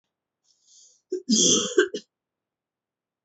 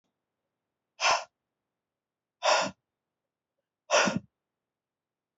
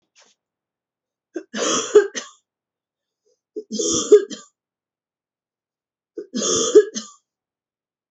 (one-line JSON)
{"cough_length": "3.2 s", "cough_amplitude": 16508, "cough_signal_mean_std_ratio": 0.35, "exhalation_length": "5.4 s", "exhalation_amplitude": 10240, "exhalation_signal_mean_std_ratio": 0.29, "three_cough_length": "8.1 s", "three_cough_amplitude": 28721, "three_cough_signal_mean_std_ratio": 0.29, "survey_phase": "beta (2021-08-13 to 2022-03-07)", "age": "18-44", "gender": "Female", "wearing_mask": "No", "symptom_runny_or_blocked_nose": true, "symptom_fatigue": true, "symptom_other": true, "smoker_status": "Never smoked", "respiratory_condition_asthma": false, "respiratory_condition_other": false, "recruitment_source": "Test and Trace", "submission_delay": "2 days", "covid_test_result": "Positive", "covid_test_method": "RT-qPCR", "covid_ct_value": 12.5, "covid_ct_gene": "ORF1ab gene", "covid_ct_mean": 13.1, "covid_viral_load": "52000000 copies/ml", "covid_viral_load_category": "High viral load (>1M copies/ml)"}